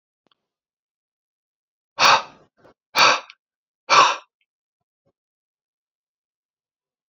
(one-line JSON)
{"exhalation_length": "7.1 s", "exhalation_amplitude": 28229, "exhalation_signal_mean_std_ratio": 0.24, "survey_phase": "alpha (2021-03-01 to 2021-08-12)", "age": "18-44", "gender": "Male", "wearing_mask": "No", "symptom_shortness_of_breath": true, "symptom_fatigue": true, "symptom_headache": true, "symptom_change_to_sense_of_smell_or_taste": true, "symptom_loss_of_taste": true, "symptom_onset": "3 days", "smoker_status": "Ex-smoker", "respiratory_condition_asthma": true, "respiratory_condition_other": false, "recruitment_source": "Test and Trace", "submission_delay": "2 days", "covid_test_result": "Positive", "covid_test_method": "RT-qPCR", "covid_ct_value": 28.7, "covid_ct_gene": "N gene"}